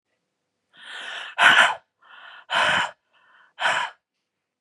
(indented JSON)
{
  "exhalation_length": "4.6 s",
  "exhalation_amplitude": 28291,
  "exhalation_signal_mean_std_ratio": 0.39,
  "survey_phase": "beta (2021-08-13 to 2022-03-07)",
  "age": "45-64",
  "gender": "Female",
  "wearing_mask": "No",
  "symptom_cough_any": true,
  "symptom_new_continuous_cough": true,
  "symptom_runny_or_blocked_nose": true,
  "symptom_shortness_of_breath": true,
  "symptom_sore_throat": true,
  "symptom_fatigue": true,
  "symptom_fever_high_temperature": true,
  "symptom_headache": true,
  "symptom_onset": "4 days",
  "smoker_status": "Ex-smoker",
  "respiratory_condition_asthma": false,
  "respiratory_condition_other": false,
  "recruitment_source": "Test and Trace",
  "submission_delay": "1 day",
  "covid_test_result": "Positive",
  "covid_test_method": "RT-qPCR",
  "covid_ct_value": 15.5,
  "covid_ct_gene": "N gene",
  "covid_ct_mean": 15.6,
  "covid_viral_load": "7800000 copies/ml",
  "covid_viral_load_category": "High viral load (>1M copies/ml)"
}